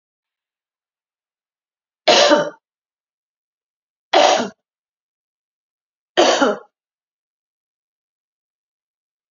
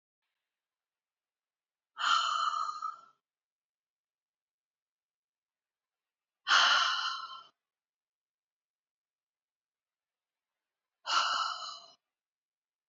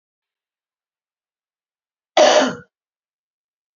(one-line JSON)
{"three_cough_length": "9.3 s", "three_cough_amplitude": 30655, "three_cough_signal_mean_std_ratio": 0.27, "exhalation_length": "12.9 s", "exhalation_amplitude": 9330, "exhalation_signal_mean_std_ratio": 0.32, "cough_length": "3.8 s", "cough_amplitude": 27668, "cough_signal_mean_std_ratio": 0.25, "survey_phase": "beta (2021-08-13 to 2022-03-07)", "age": "45-64", "gender": "Female", "wearing_mask": "No", "symptom_none": true, "smoker_status": "Never smoked", "respiratory_condition_asthma": false, "respiratory_condition_other": false, "recruitment_source": "REACT", "submission_delay": "2 days", "covid_test_result": "Negative", "covid_test_method": "RT-qPCR", "influenza_a_test_result": "Unknown/Void", "influenza_b_test_result": "Unknown/Void"}